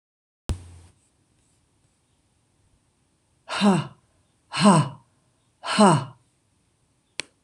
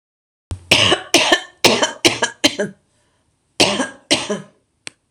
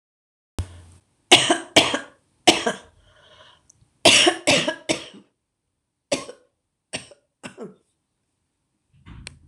{"exhalation_length": "7.4 s", "exhalation_amplitude": 24829, "exhalation_signal_mean_std_ratio": 0.29, "cough_length": "5.1 s", "cough_amplitude": 26028, "cough_signal_mean_std_ratio": 0.44, "three_cough_length": "9.5 s", "three_cough_amplitude": 26028, "three_cough_signal_mean_std_ratio": 0.3, "survey_phase": "beta (2021-08-13 to 2022-03-07)", "age": "65+", "gender": "Female", "wearing_mask": "No", "symptom_shortness_of_breath": true, "symptom_fatigue": true, "smoker_status": "Ex-smoker", "respiratory_condition_asthma": false, "respiratory_condition_other": true, "recruitment_source": "REACT", "submission_delay": "5 days", "covid_test_result": "Negative", "covid_test_method": "RT-qPCR", "influenza_a_test_result": "Negative", "influenza_b_test_result": "Negative"}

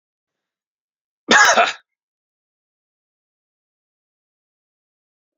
{"cough_length": "5.4 s", "cough_amplitude": 30732, "cough_signal_mean_std_ratio": 0.22, "survey_phase": "beta (2021-08-13 to 2022-03-07)", "age": "65+", "gender": "Male", "wearing_mask": "No", "symptom_none": true, "smoker_status": "Never smoked", "respiratory_condition_asthma": false, "respiratory_condition_other": false, "recruitment_source": "REACT", "submission_delay": "2 days", "covid_test_result": "Negative", "covid_test_method": "RT-qPCR", "influenza_a_test_result": "Negative", "influenza_b_test_result": "Negative"}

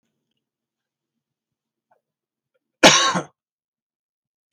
{"cough_length": "4.5 s", "cough_amplitude": 32768, "cough_signal_mean_std_ratio": 0.2, "survey_phase": "beta (2021-08-13 to 2022-03-07)", "age": "65+", "gender": "Male", "wearing_mask": "No", "symptom_none": true, "smoker_status": "Never smoked", "respiratory_condition_asthma": false, "respiratory_condition_other": false, "recruitment_source": "REACT", "submission_delay": "5 days", "covid_test_result": "Negative", "covid_test_method": "RT-qPCR", "influenza_a_test_result": "Negative", "influenza_b_test_result": "Negative"}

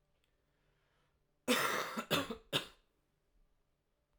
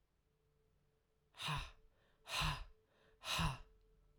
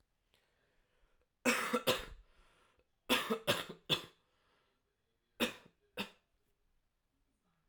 {"cough_length": "4.2 s", "cough_amplitude": 3951, "cough_signal_mean_std_ratio": 0.35, "exhalation_length": "4.2 s", "exhalation_amplitude": 1726, "exhalation_signal_mean_std_ratio": 0.42, "three_cough_length": "7.7 s", "three_cough_amplitude": 4515, "three_cough_signal_mean_std_ratio": 0.31, "survey_phase": "alpha (2021-03-01 to 2021-08-12)", "age": "18-44", "gender": "Male", "wearing_mask": "No", "symptom_cough_any": true, "symptom_new_continuous_cough": true, "symptom_fatigue": true, "symptom_fever_high_temperature": true, "symptom_headache": true, "symptom_change_to_sense_of_smell_or_taste": true, "symptom_loss_of_taste": true, "symptom_onset": "2 days", "smoker_status": "Never smoked", "respiratory_condition_asthma": false, "respiratory_condition_other": false, "recruitment_source": "Test and Trace", "submission_delay": "2 days", "covid_test_result": "Positive", "covid_test_method": "RT-qPCR", "covid_ct_value": 21.9, "covid_ct_gene": "ORF1ab gene", "covid_ct_mean": 22.9, "covid_viral_load": "30000 copies/ml", "covid_viral_load_category": "Low viral load (10K-1M copies/ml)"}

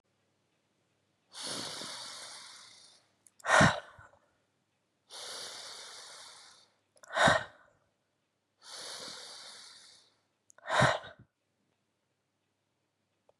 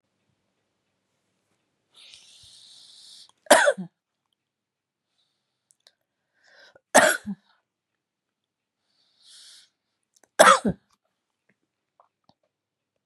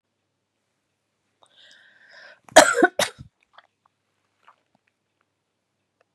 {"exhalation_length": "13.4 s", "exhalation_amplitude": 11463, "exhalation_signal_mean_std_ratio": 0.28, "three_cough_length": "13.1 s", "three_cough_amplitude": 32616, "three_cough_signal_mean_std_ratio": 0.18, "cough_length": "6.1 s", "cough_amplitude": 32768, "cough_signal_mean_std_ratio": 0.17, "survey_phase": "beta (2021-08-13 to 2022-03-07)", "age": "45-64", "gender": "Female", "wearing_mask": "No", "symptom_cough_any": true, "symptom_runny_or_blocked_nose": true, "symptom_sore_throat": true, "symptom_headache": true, "smoker_status": "Never smoked", "respiratory_condition_asthma": false, "respiratory_condition_other": false, "recruitment_source": "Test and Trace", "submission_delay": "2 days", "covid_test_result": "Positive", "covid_test_method": "LFT"}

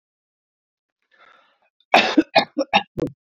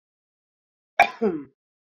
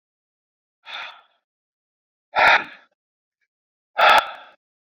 {"three_cough_length": "3.3 s", "three_cough_amplitude": 27789, "three_cough_signal_mean_std_ratio": 0.3, "cough_length": "1.9 s", "cough_amplitude": 28238, "cough_signal_mean_std_ratio": 0.26, "exhalation_length": "4.9 s", "exhalation_amplitude": 26423, "exhalation_signal_mean_std_ratio": 0.28, "survey_phase": "beta (2021-08-13 to 2022-03-07)", "age": "18-44", "gender": "Female", "wearing_mask": "No", "symptom_cough_any": true, "symptom_new_continuous_cough": true, "symptom_runny_or_blocked_nose": true, "symptom_shortness_of_breath": true, "symptom_sore_throat": true, "symptom_abdominal_pain": true, "symptom_fatigue": true, "symptom_headache": true, "symptom_change_to_sense_of_smell_or_taste": true, "smoker_status": "Ex-smoker", "respiratory_condition_asthma": false, "respiratory_condition_other": false, "recruitment_source": "Test and Trace", "submission_delay": "2 days", "covid_test_result": "Positive", "covid_test_method": "RT-qPCR"}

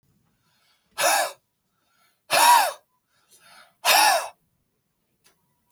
{"exhalation_length": "5.7 s", "exhalation_amplitude": 21609, "exhalation_signal_mean_std_ratio": 0.36, "survey_phase": "beta (2021-08-13 to 2022-03-07)", "age": "45-64", "gender": "Male", "wearing_mask": "No", "symptom_none": true, "smoker_status": "Never smoked", "respiratory_condition_asthma": false, "respiratory_condition_other": false, "recruitment_source": "REACT", "submission_delay": "1 day", "covid_test_result": "Negative", "covid_test_method": "RT-qPCR", "influenza_a_test_result": "Negative", "influenza_b_test_result": "Negative"}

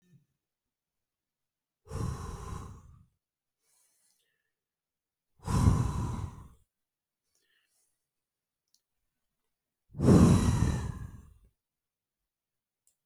{"exhalation_length": "13.1 s", "exhalation_amplitude": 10921, "exhalation_signal_mean_std_ratio": 0.29, "survey_phase": "beta (2021-08-13 to 2022-03-07)", "age": "45-64", "wearing_mask": "No", "symptom_none": true, "smoker_status": "Never smoked", "respiratory_condition_asthma": true, "respiratory_condition_other": false, "recruitment_source": "REACT", "submission_delay": "1 day", "covid_test_result": "Negative", "covid_test_method": "RT-qPCR", "influenza_a_test_result": "Negative", "influenza_b_test_result": "Negative"}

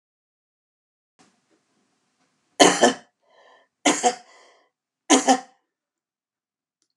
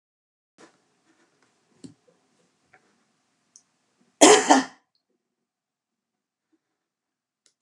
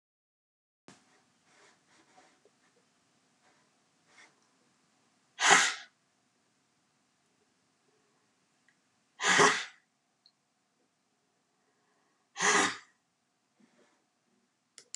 {"three_cough_length": "7.0 s", "three_cough_amplitude": 32743, "three_cough_signal_mean_std_ratio": 0.25, "cough_length": "7.6 s", "cough_amplitude": 32768, "cough_signal_mean_std_ratio": 0.17, "exhalation_length": "15.0 s", "exhalation_amplitude": 15315, "exhalation_signal_mean_std_ratio": 0.21, "survey_phase": "alpha (2021-03-01 to 2021-08-12)", "age": "65+", "gender": "Female", "wearing_mask": "No", "symptom_none": true, "smoker_status": "Ex-smoker", "respiratory_condition_asthma": false, "respiratory_condition_other": false, "recruitment_source": "REACT", "submission_delay": "1 day", "covid_test_result": "Negative", "covid_test_method": "RT-qPCR"}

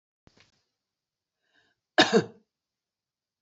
{"cough_length": "3.4 s", "cough_amplitude": 16492, "cough_signal_mean_std_ratio": 0.19, "survey_phase": "beta (2021-08-13 to 2022-03-07)", "age": "65+", "gender": "Female", "wearing_mask": "No", "symptom_runny_or_blocked_nose": true, "symptom_onset": "12 days", "smoker_status": "Ex-smoker", "respiratory_condition_asthma": false, "respiratory_condition_other": false, "recruitment_source": "REACT", "submission_delay": "2 days", "covid_test_result": "Negative", "covid_test_method": "RT-qPCR", "influenza_a_test_result": "Negative", "influenza_b_test_result": "Negative"}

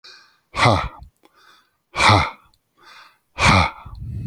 {"exhalation_length": "4.3 s", "exhalation_amplitude": 30333, "exhalation_signal_mean_std_ratio": 0.42, "survey_phase": "alpha (2021-03-01 to 2021-08-12)", "age": "65+", "gender": "Male", "wearing_mask": "No", "symptom_none": true, "smoker_status": "Ex-smoker", "respiratory_condition_asthma": false, "respiratory_condition_other": false, "recruitment_source": "REACT", "submission_delay": "2 days", "covid_test_result": "Negative", "covid_test_method": "RT-qPCR"}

